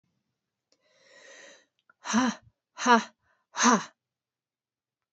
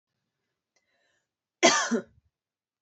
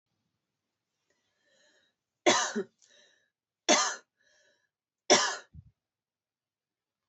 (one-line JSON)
{"exhalation_length": "5.1 s", "exhalation_amplitude": 16038, "exhalation_signal_mean_std_ratio": 0.29, "cough_length": "2.8 s", "cough_amplitude": 18908, "cough_signal_mean_std_ratio": 0.26, "three_cough_length": "7.1 s", "three_cough_amplitude": 13094, "three_cough_signal_mean_std_ratio": 0.25, "survey_phase": "beta (2021-08-13 to 2022-03-07)", "age": "18-44", "gender": "Female", "wearing_mask": "No", "symptom_runny_or_blocked_nose": true, "symptom_fatigue": true, "symptom_headache": true, "smoker_status": "Never smoked", "respiratory_condition_asthma": false, "respiratory_condition_other": false, "recruitment_source": "Test and Trace", "submission_delay": "2 days", "covid_test_result": "Positive", "covid_test_method": "RT-qPCR", "covid_ct_value": 20.1, "covid_ct_gene": "ORF1ab gene", "covid_ct_mean": 20.5, "covid_viral_load": "190000 copies/ml", "covid_viral_load_category": "Low viral load (10K-1M copies/ml)"}